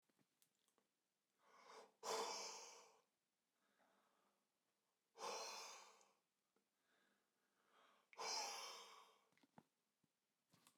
{"exhalation_length": "10.8 s", "exhalation_amplitude": 599, "exhalation_signal_mean_std_ratio": 0.38, "survey_phase": "beta (2021-08-13 to 2022-03-07)", "age": "45-64", "gender": "Male", "wearing_mask": "No", "symptom_fatigue": true, "smoker_status": "Never smoked", "respiratory_condition_asthma": false, "respiratory_condition_other": false, "recruitment_source": "REACT", "submission_delay": "1 day", "covid_test_result": "Negative", "covid_test_method": "RT-qPCR"}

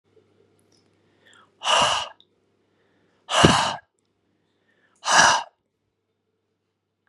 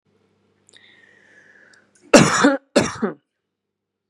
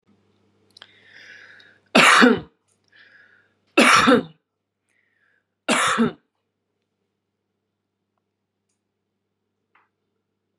{"exhalation_length": "7.1 s", "exhalation_amplitude": 32768, "exhalation_signal_mean_std_ratio": 0.31, "cough_length": "4.1 s", "cough_amplitude": 32768, "cough_signal_mean_std_ratio": 0.29, "three_cough_length": "10.6 s", "three_cough_amplitude": 31961, "three_cough_signal_mean_std_ratio": 0.28, "survey_phase": "beta (2021-08-13 to 2022-03-07)", "age": "45-64", "gender": "Female", "wearing_mask": "No", "symptom_none": true, "smoker_status": "Never smoked", "respiratory_condition_asthma": false, "respiratory_condition_other": false, "recruitment_source": "Test and Trace", "submission_delay": "2 days", "covid_test_result": "Positive", "covid_test_method": "RT-qPCR", "covid_ct_value": 33.5, "covid_ct_gene": "N gene"}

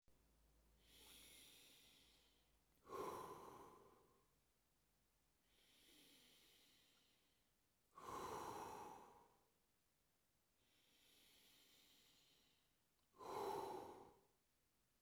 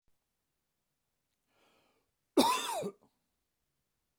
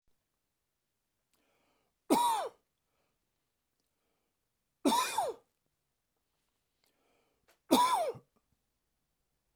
{"exhalation_length": "15.0 s", "exhalation_amplitude": 404, "exhalation_signal_mean_std_ratio": 0.44, "cough_length": "4.2 s", "cough_amplitude": 7151, "cough_signal_mean_std_ratio": 0.25, "three_cough_length": "9.6 s", "three_cough_amplitude": 8877, "three_cough_signal_mean_std_ratio": 0.29, "survey_phase": "beta (2021-08-13 to 2022-03-07)", "age": "45-64", "gender": "Male", "wearing_mask": "No", "symptom_none": true, "smoker_status": "Current smoker (1 to 10 cigarettes per day)", "respiratory_condition_asthma": false, "respiratory_condition_other": false, "recruitment_source": "REACT", "submission_delay": "2 days", "covid_test_result": "Negative", "covid_test_method": "RT-qPCR", "influenza_a_test_result": "Unknown/Void", "influenza_b_test_result": "Unknown/Void"}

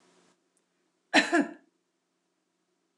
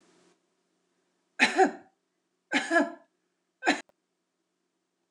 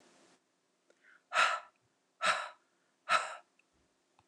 {"cough_length": "3.0 s", "cough_amplitude": 11813, "cough_signal_mean_std_ratio": 0.24, "three_cough_length": "5.1 s", "three_cough_amplitude": 13965, "three_cough_signal_mean_std_ratio": 0.29, "exhalation_length": "4.3 s", "exhalation_amplitude": 6512, "exhalation_signal_mean_std_ratio": 0.32, "survey_phase": "beta (2021-08-13 to 2022-03-07)", "age": "45-64", "gender": "Female", "wearing_mask": "No", "symptom_none": true, "smoker_status": "Never smoked", "respiratory_condition_asthma": false, "respiratory_condition_other": false, "recruitment_source": "REACT", "submission_delay": "2 days", "covid_test_result": "Negative", "covid_test_method": "RT-qPCR"}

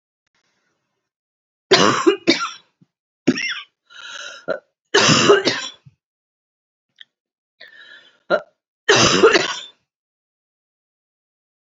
{"three_cough_length": "11.6 s", "three_cough_amplitude": 32768, "three_cough_signal_mean_std_ratio": 0.35, "survey_phase": "beta (2021-08-13 to 2022-03-07)", "age": "45-64", "gender": "Female", "wearing_mask": "No", "symptom_none": true, "smoker_status": "Never smoked", "respiratory_condition_asthma": false, "respiratory_condition_other": false, "recruitment_source": "REACT", "submission_delay": "1 day", "covid_test_result": "Negative", "covid_test_method": "RT-qPCR"}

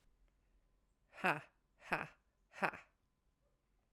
{"exhalation_length": "3.9 s", "exhalation_amplitude": 4417, "exhalation_signal_mean_std_ratio": 0.24, "survey_phase": "beta (2021-08-13 to 2022-03-07)", "age": "45-64", "gender": "Female", "wearing_mask": "No", "symptom_cough_any": true, "symptom_runny_or_blocked_nose": true, "symptom_shortness_of_breath": true, "symptom_fatigue": true, "symptom_headache": true, "symptom_loss_of_taste": true, "smoker_status": "Never smoked", "respiratory_condition_asthma": false, "respiratory_condition_other": false, "recruitment_source": "Test and Trace", "submission_delay": "2 days", "covid_test_result": "Positive", "covid_test_method": "LFT"}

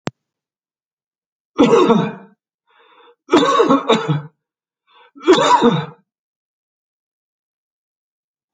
{"three_cough_length": "8.5 s", "three_cough_amplitude": 31283, "three_cough_signal_mean_std_ratio": 0.39, "survey_phase": "alpha (2021-03-01 to 2021-08-12)", "age": "65+", "gender": "Male", "wearing_mask": "No", "symptom_none": true, "smoker_status": "Ex-smoker", "respiratory_condition_asthma": false, "respiratory_condition_other": false, "recruitment_source": "REACT", "submission_delay": "1 day", "covid_test_result": "Negative", "covid_test_method": "RT-qPCR"}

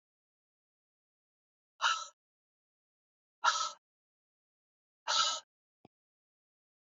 {"exhalation_length": "7.0 s", "exhalation_amplitude": 6213, "exhalation_signal_mean_std_ratio": 0.25, "survey_phase": "beta (2021-08-13 to 2022-03-07)", "age": "45-64", "gender": "Female", "wearing_mask": "No", "symptom_cough_any": true, "symptom_runny_or_blocked_nose": true, "smoker_status": "Never smoked", "respiratory_condition_asthma": false, "respiratory_condition_other": false, "recruitment_source": "Test and Trace", "submission_delay": "1 day", "covid_test_result": "Positive", "covid_test_method": "LFT"}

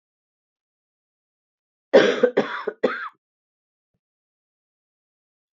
{"three_cough_length": "5.5 s", "three_cough_amplitude": 26630, "three_cough_signal_mean_std_ratio": 0.25, "survey_phase": "beta (2021-08-13 to 2022-03-07)", "age": "65+", "gender": "Female", "wearing_mask": "No", "symptom_cough_any": true, "symptom_runny_or_blocked_nose": true, "symptom_fatigue": true, "symptom_fever_high_temperature": true, "symptom_headache": true, "symptom_change_to_sense_of_smell_or_taste": true, "symptom_onset": "6 days", "smoker_status": "Never smoked", "respiratory_condition_asthma": false, "respiratory_condition_other": false, "recruitment_source": "Test and Trace", "submission_delay": "2 days", "covid_test_result": "Positive", "covid_test_method": "RT-qPCR"}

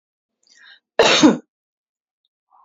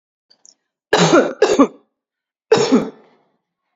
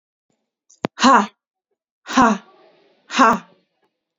{"cough_length": "2.6 s", "cough_amplitude": 27670, "cough_signal_mean_std_ratio": 0.3, "three_cough_length": "3.8 s", "three_cough_amplitude": 32767, "three_cough_signal_mean_std_ratio": 0.4, "exhalation_length": "4.2 s", "exhalation_amplitude": 32767, "exhalation_signal_mean_std_ratio": 0.33, "survey_phase": "beta (2021-08-13 to 2022-03-07)", "age": "18-44", "gender": "Female", "wearing_mask": "Yes", "symptom_fatigue": true, "symptom_onset": "12 days", "smoker_status": "Never smoked", "respiratory_condition_asthma": false, "respiratory_condition_other": true, "recruitment_source": "REACT", "submission_delay": "0 days", "covid_test_result": "Negative", "covid_test_method": "RT-qPCR"}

